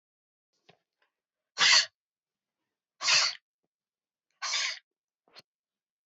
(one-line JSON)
{"exhalation_length": "6.1 s", "exhalation_amplitude": 11584, "exhalation_signal_mean_std_ratio": 0.28, "survey_phase": "beta (2021-08-13 to 2022-03-07)", "age": "65+", "gender": "Female", "wearing_mask": "No", "symptom_runny_or_blocked_nose": true, "symptom_change_to_sense_of_smell_or_taste": true, "symptom_onset": "2 days", "smoker_status": "Never smoked", "respiratory_condition_asthma": false, "respiratory_condition_other": false, "recruitment_source": "Test and Trace", "submission_delay": "1 day", "covid_test_result": "Positive", "covid_test_method": "RT-qPCR", "covid_ct_value": 18.9, "covid_ct_gene": "N gene"}